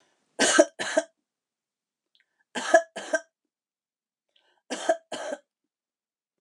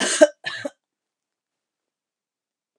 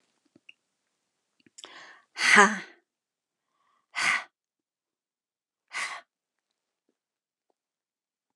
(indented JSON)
{
  "three_cough_length": "6.4 s",
  "three_cough_amplitude": 25613,
  "three_cough_signal_mean_std_ratio": 0.28,
  "cough_length": "2.8 s",
  "cough_amplitude": 31992,
  "cough_signal_mean_std_ratio": 0.22,
  "exhalation_length": "8.4 s",
  "exhalation_amplitude": 29108,
  "exhalation_signal_mean_std_ratio": 0.21,
  "survey_phase": "alpha (2021-03-01 to 2021-08-12)",
  "age": "45-64",
  "gender": "Female",
  "wearing_mask": "No",
  "symptom_none": true,
  "smoker_status": "Never smoked",
  "respiratory_condition_asthma": false,
  "respiratory_condition_other": false,
  "recruitment_source": "REACT",
  "submission_delay": "2 days",
  "covid_test_result": "Negative",
  "covid_test_method": "RT-qPCR"
}